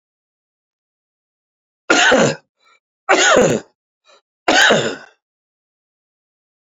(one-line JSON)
{"three_cough_length": "6.7 s", "three_cough_amplitude": 31498, "three_cough_signal_mean_std_ratio": 0.37, "survey_phase": "beta (2021-08-13 to 2022-03-07)", "age": "65+", "gender": "Male", "wearing_mask": "No", "symptom_cough_any": true, "symptom_runny_or_blocked_nose": true, "symptom_fatigue": true, "symptom_change_to_sense_of_smell_or_taste": true, "symptom_loss_of_taste": true, "smoker_status": "Ex-smoker", "respiratory_condition_asthma": true, "respiratory_condition_other": true, "recruitment_source": "Test and Trace", "submission_delay": "1 day", "covid_test_result": "Positive", "covid_test_method": "RT-qPCR", "covid_ct_value": 19.1, "covid_ct_gene": "ORF1ab gene"}